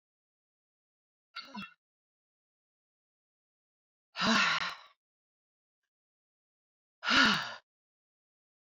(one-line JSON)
{"exhalation_length": "8.6 s", "exhalation_amplitude": 7676, "exhalation_signal_mean_std_ratio": 0.27, "survey_phase": "beta (2021-08-13 to 2022-03-07)", "age": "45-64", "gender": "Female", "wearing_mask": "No", "symptom_none": true, "smoker_status": "Never smoked", "respiratory_condition_asthma": false, "respiratory_condition_other": false, "recruitment_source": "REACT", "submission_delay": "2 days", "covid_test_result": "Negative", "covid_test_method": "RT-qPCR"}